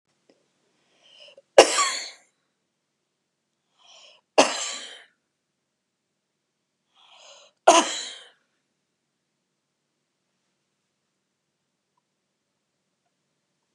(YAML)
three_cough_length: 13.7 s
three_cough_amplitude: 32768
three_cough_signal_mean_std_ratio: 0.17
survey_phase: beta (2021-08-13 to 2022-03-07)
age: 65+
gender: Female
wearing_mask: 'No'
symptom_none: true
smoker_status: Never smoked
respiratory_condition_asthma: false
respiratory_condition_other: false
recruitment_source: REACT
submission_delay: 0 days
covid_test_result: Negative
covid_test_method: RT-qPCR